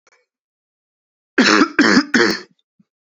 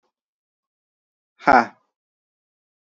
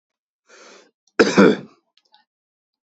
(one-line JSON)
{"three_cough_length": "3.2 s", "three_cough_amplitude": 32768, "three_cough_signal_mean_std_ratio": 0.41, "exhalation_length": "2.8 s", "exhalation_amplitude": 27293, "exhalation_signal_mean_std_ratio": 0.18, "cough_length": "2.9 s", "cough_amplitude": 32042, "cough_signal_mean_std_ratio": 0.26, "survey_phase": "alpha (2021-03-01 to 2021-08-12)", "age": "18-44", "gender": "Male", "wearing_mask": "No", "symptom_cough_any": true, "symptom_new_continuous_cough": true, "symptom_fatigue": true, "symptom_headache": true, "symptom_onset": "4 days", "smoker_status": "Never smoked", "respiratory_condition_asthma": false, "respiratory_condition_other": false, "recruitment_source": "Test and Trace", "submission_delay": "2 days", "covid_test_result": "Positive", "covid_test_method": "RT-qPCR"}